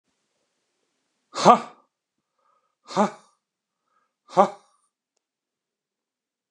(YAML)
exhalation_length: 6.5 s
exhalation_amplitude: 29140
exhalation_signal_mean_std_ratio: 0.18
survey_phase: beta (2021-08-13 to 2022-03-07)
age: 45-64
gender: Male
wearing_mask: 'No'
symptom_none: true
smoker_status: Never smoked
respiratory_condition_asthma: false
respiratory_condition_other: false
recruitment_source: REACT
submission_delay: 6 days
covid_test_result: Negative
covid_test_method: RT-qPCR